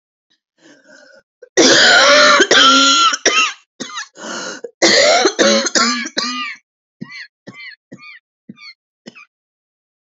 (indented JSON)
{
  "cough_length": "10.2 s",
  "cough_amplitude": 32079,
  "cough_signal_mean_std_ratio": 0.51,
  "survey_phase": "beta (2021-08-13 to 2022-03-07)",
  "age": "18-44",
  "gender": "Female",
  "wearing_mask": "No",
  "symptom_cough_any": true,
  "symptom_shortness_of_breath": true,
  "symptom_sore_throat": true,
  "symptom_fatigue": true,
  "smoker_status": "Never smoked",
  "respiratory_condition_asthma": false,
  "respiratory_condition_other": false,
  "recruitment_source": "Test and Trace",
  "submission_delay": "2 days",
  "covid_test_result": "Positive",
  "covid_test_method": "RT-qPCR",
  "covid_ct_value": 20.1,
  "covid_ct_gene": "ORF1ab gene",
  "covid_ct_mean": 20.5,
  "covid_viral_load": "190000 copies/ml",
  "covid_viral_load_category": "Low viral load (10K-1M copies/ml)"
}